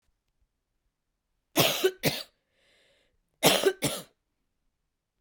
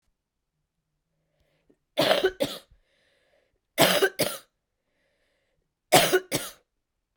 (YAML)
cough_length: 5.2 s
cough_amplitude: 18540
cough_signal_mean_std_ratio: 0.31
three_cough_length: 7.2 s
three_cough_amplitude: 26028
three_cough_signal_mean_std_ratio: 0.31
survey_phase: beta (2021-08-13 to 2022-03-07)
age: 18-44
gender: Female
wearing_mask: 'No'
symptom_cough_any: true
symptom_shortness_of_breath: true
symptom_fatigue: true
symptom_headache: true
symptom_other: true
smoker_status: Never smoked
respiratory_condition_asthma: false
respiratory_condition_other: false
recruitment_source: Test and Trace
submission_delay: 2 days
covid_test_result: Positive
covid_test_method: RT-qPCR
covid_ct_value: 32.2
covid_ct_gene: N gene